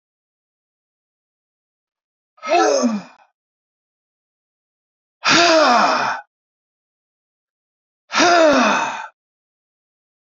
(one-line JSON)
{"exhalation_length": "10.3 s", "exhalation_amplitude": 29655, "exhalation_signal_mean_std_ratio": 0.39, "survey_phase": "beta (2021-08-13 to 2022-03-07)", "age": "65+", "gender": "Male", "wearing_mask": "No", "symptom_none": true, "smoker_status": "Never smoked", "respiratory_condition_asthma": false, "respiratory_condition_other": false, "recruitment_source": "REACT", "submission_delay": "3 days", "covid_test_result": "Negative", "covid_test_method": "RT-qPCR", "influenza_a_test_result": "Negative", "influenza_b_test_result": "Negative"}